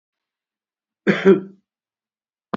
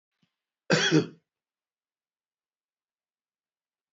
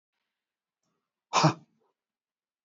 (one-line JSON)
{"three_cough_length": "2.6 s", "three_cough_amplitude": 26883, "three_cough_signal_mean_std_ratio": 0.25, "cough_length": "3.9 s", "cough_amplitude": 11206, "cough_signal_mean_std_ratio": 0.23, "exhalation_length": "2.6 s", "exhalation_amplitude": 12843, "exhalation_signal_mean_std_ratio": 0.21, "survey_phase": "beta (2021-08-13 to 2022-03-07)", "age": "65+", "gender": "Male", "wearing_mask": "No", "symptom_none": true, "smoker_status": "Ex-smoker", "respiratory_condition_asthma": false, "respiratory_condition_other": false, "recruitment_source": "REACT", "submission_delay": "0 days", "covid_test_result": "Negative", "covid_test_method": "RT-qPCR", "influenza_a_test_result": "Negative", "influenza_b_test_result": "Negative"}